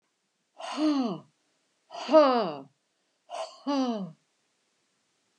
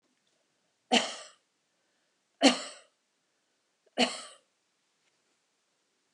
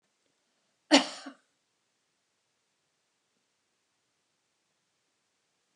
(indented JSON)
{
  "exhalation_length": "5.4 s",
  "exhalation_amplitude": 15645,
  "exhalation_signal_mean_std_ratio": 0.39,
  "three_cough_length": "6.1 s",
  "three_cough_amplitude": 15706,
  "three_cough_signal_mean_std_ratio": 0.21,
  "cough_length": "5.8 s",
  "cough_amplitude": 16123,
  "cough_signal_mean_std_ratio": 0.13,
  "survey_phase": "alpha (2021-03-01 to 2021-08-12)",
  "age": "65+",
  "gender": "Female",
  "wearing_mask": "No",
  "symptom_none": true,
  "smoker_status": "Ex-smoker",
  "respiratory_condition_asthma": false,
  "respiratory_condition_other": false,
  "recruitment_source": "REACT",
  "submission_delay": "1 day",
  "covid_test_result": "Negative",
  "covid_test_method": "RT-qPCR"
}